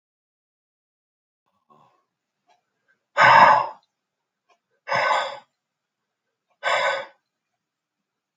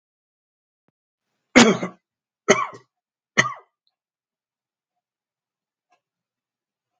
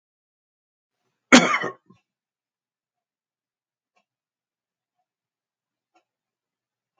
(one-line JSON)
{"exhalation_length": "8.4 s", "exhalation_amplitude": 32296, "exhalation_signal_mean_std_ratio": 0.28, "three_cough_length": "7.0 s", "three_cough_amplitude": 32767, "three_cough_signal_mean_std_ratio": 0.19, "cough_length": "7.0 s", "cough_amplitude": 32767, "cough_signal_mean_std_ratio": 0.14, "survey_phase": "beta (2021-08-13 to 2022-03-07)", "age": "65+", "gender": "Male", "wearing_mask": "No", "symptom_none": true, "smoker_status": "Never smoked", "respiratory_condition_asthma": false, "respiratory_condition_other": false, "recruitment_source": "REACT", "submission_delay": "0 days", "covid_test_result": "Negative", "covid_test_method": "RT-qPCR", "influenza_a_test_result": "Negative", "influenza_b_test_result": "Negative"}